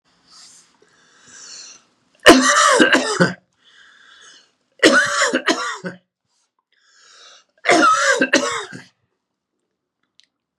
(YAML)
three_cough_length: 10.6 s
three_cough_amplitude: 32768
three_cough_signal_mean_std_ratio: 0.4
survey_phase: beta (2021-08-13 to 2022-03-07)
age: 65+
gender: Male
wearing_mask: 'No'
symptom_none: true
smoker_status: Never smoked
respiratory_condition_asthma: false
respiratory_condition_other: false
recruitment_source: REACT
submission_delay: 1 day
covid_test_result: Negative
covid_test_method: RT-qPCR